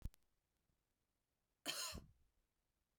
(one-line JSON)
{"cough_length": "3.0 s", "cough_amplitude": 1123, "cough_signal_mean_std_ratio": 0.3, "survey_phase": "beta (2021-08-13 to 2022-03-07)", "age": "18-44", "gender": "Female", "wearing_mask": "No", "symptom_none": true, "smoker_status": "Never smoked", "respiratory_condition_asthma": false, "respiratory_condition_other": false, "recruitment_source": "REACT", "submission_delay": "1 day", "covid_test_result": "Negative", "covid_test_method": "RT-qPCR", "influenza_a_test_result": "Negative", "influenza_b_test_result": "Negative"}